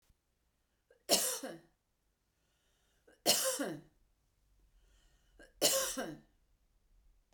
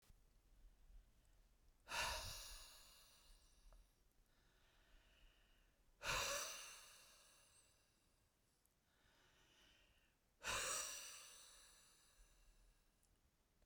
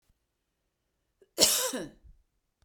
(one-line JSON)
{"three_cough_length": "7.3 s", "three_cough_amplitude": 7153, "three_cough_signal_mean_std_ratio": 0.33, "exhalation_length": "13.7 s", "exhalation_amplitude": 865, "exhalation_signal_mean_std_ratio": 0.41, "cough_length": "2.6 s", "cough_amplitude": 19397, "cough_signal_mean_std_ratio": 0.3, "survey_phase": "beta (2021-08-13 to 2022-03-07)", "age": "45-64", "gender": "Female", "wearing_mask": "No", "symptom_none": true, "smoker_status": "Ex-smoker", "respiratory_condition_asthma": false, "respiratory_condition_other": false, "recruitment_source": "REACT", "submission_delay": "1 day", "covid_test_result": "Negative", "covid_test_method": "RT-qPCR"}